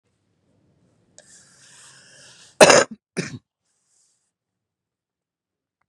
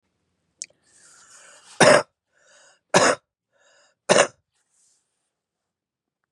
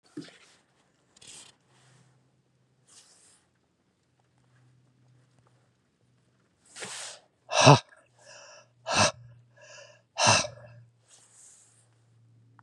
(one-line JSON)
{"cough_length": "5.9 s", "cough_amplitude": 32768, "cough_signal_mean_std_ratio": 0.17, "three_cough_length": "6.3 s", "three_cough_amplitude": 29512, "three_cough_signal_mean_std_ratio": 0.24, "exhalation_length": "12.6 s", "exhalation_amplitude": 29448, "exhalation_signal_mean_std_ratio": 0.21, "survey_phase": "beta (2021-08-13 to 2022-03-07)", "age": "45-64", "gender": "Male", "wearing_mask": "No", "symptom_cough_any": true, "smoker_status": "Current smoker (e-cigarettes or vapes only)", "respiratory_condition_asthma": true, "respiratory_condition_other": false, "recruitment_source": "REACT", "submission_delay": "1 day", "covid_test_result": "Negative", "covid_test_method": "RT-qPCR", "influenza_a_test_result": "Unknown/Void", "influenza_b_test_result": "Unknown/Void"}